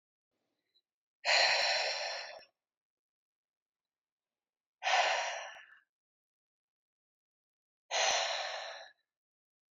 {"exhalation_length": "9.7 s", "exhalation_amplitude": 6286, "exhalation_signal_mean_std_ratio": 0.39, "survey_phase": "beta (2021-08-13 to 2022-03-07)", "age": "65+", "gender": "Female", "wearing_mask": "No", "symptom_none": true, "smoker_status": "Never smoked", "respiratory_condition_asthma": false, "respiratory_condition_other": false, "recruitment_source": "REACT", "submission_delay": "3 days", "covid_test_result": "Negative", "covid_test_method": "RT-qPCR", "influenza_a_test_result": "Negative", "influenza_b_test_result": "Negative"}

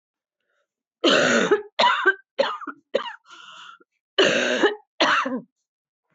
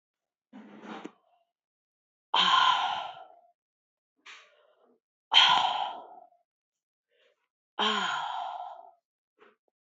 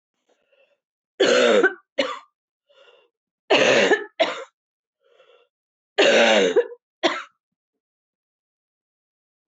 {"cough_length": "6.1 s", "cough_amplitude": 18116, "cough_signal_mean_std_ratio": 0.49, "exhalation_length": "9.8 s", "exhalation_amplitude": 16190, "exhalation_signal_mean_std_ratio": 0.36, "three_cough_length": "9.5 s", "three_cough_amplitude": 20470, "three_cough_signal_mean_std_ratio": 0.39, "survey_phase": "beta (2021-08-13 to 2022-03-07)", "age": "65+", "gender": "Female", "wearing_mask": "No", "symptom_cough_any": true, "symptom_runny_or_blocked_nose": true, "symptom_fatigue": true, "symptom_fever_high_temperature": true, "symptom_headache": true, "symptom_change_to_sense_of_smell_or_taste": true, "symptom_onset": "6 days", "smoker_status": "Never smoked", "respiratory_condition_asthma": false, "respiratory_condition_other": false, "recruitment_source": "Test and Trace", "submission_delay": "1 day", "covid_test_result": "Positive", "covid_test_method": "RT-qPCR", "covid_ct_value": 24.3, "covid_ct_gene": "ORF1ab gene", "covid_ct_mean": 25.2, "covid_viral_load": "5300 copies/ml", "covid_viral_load_category": "Minimal viral load (< 10K copies/ml)"}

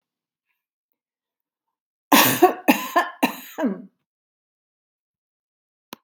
{"cough_length": "6.0 s", "cough_amplitude": 32413, "cough_signal_mean_std_ratio": 0.28, "survey_phase": "beta (2021-08-13 to 2022-03-07)", "age": "65+", "gender": "Female", "wearing_mask": "No", "symptom_none": true, "smoker_status": "Ex-smoker", "respiratory_condition_asthma": false, "respiratory_condition_other": false, "recruitment_source": "Test and Trace", "submission_delay": "3 days", "covid_test_result": "Negative", "covid_test_method": "RT-qPCR"}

